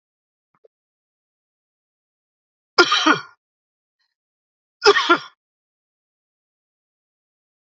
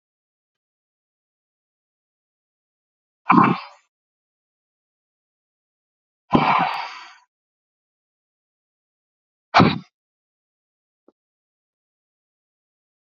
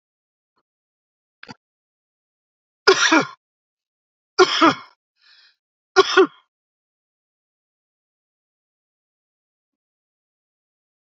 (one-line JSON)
{"cough_length": "7.8 s", "cough_amplitude": 32767, "cough_signal_mean_std_ratio": 0.21, "exhalation_length": "13.1 s", "exhalation_amplitude": 30019, "exhalation_signal_mean_std_ratio": 0.2, "three_cough_length": "11.1 s", "three_cough_amplitude": 31829, "three_cough_signal_mean_std_ratio": 0.21, "survey_phase": "alpha (2021-03-01 to 2021-08-12)", "age": "65+", "gender": "Male", "wearing_mask": "No", "symptom_none": true, "smoker_status": "Ex-smoker", "respiratory_condition_asthma": false, "respiratory_condition_other": false, "recruitment_source": "REACT", "submission_delay": "1 day", "covid_test_result": "Negative", "covid_test_method": "RT-qPCR"}